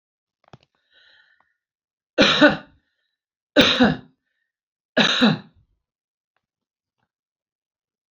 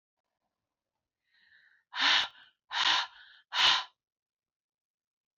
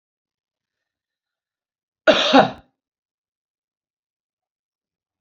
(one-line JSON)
{"three_cough_length": "8.1 s", "three_cough_amplitude": 26566, "three_cough_signal_mean_std_ratio": 0.29, "exhalation_length": "5.4 s", "exhalation_amplitude": 9651, "exhalation_signal_mean_std_ratio": 0.33, "cough_length": "5.2 s", "cough_amplitude": 29332, "cough_signal_mean_std_ratio": 0.2, "survey_phase": "beta (2021-08-13 to 2022-03-07)", "age": "45-64", "gender": "Female", "wearing_mask": "No", "symptom_none": true, "smoker_status": "Never smoked", "respiratory_condition_asthma": false, "respiratory_condition_other": false, "recruitment_source": "REACT", "submission_delay": "3 days", "covid_test_result": "Negative", "covid_test_method": "RT-qPCR"}